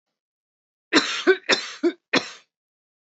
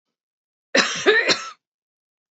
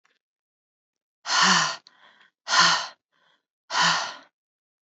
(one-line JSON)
{"three_cough_length": "3.1 s", "three_cough_amplitude": 24610, "three_cough_signal_mean_std_ratio": 0.36, "cough_length": "2.3 s", "cough_amplitude": 25235, "cough_signal_mean_std_ratio": 0.39, "exhalation_length": "4.9 s", "exhalation_amplitude": 20547, "exhalation_signal_mean_std_ratio": 0.4, "survey_phase": "beta (2021-08-13 to 2022-03-07)", "age": "45-64", "gender": "Female", "wearing_mask": "No", "symptom_sore_throat": true, "smoker_status": "Never smoked", "respiratory_condition_asthma": false, "respiratory_condition_other": false, "recruitment_source": "Test and Trace", "submission_delay": "2 days", "covid_test_result": "Negative", "covid_test_method": "RT-qPCR"}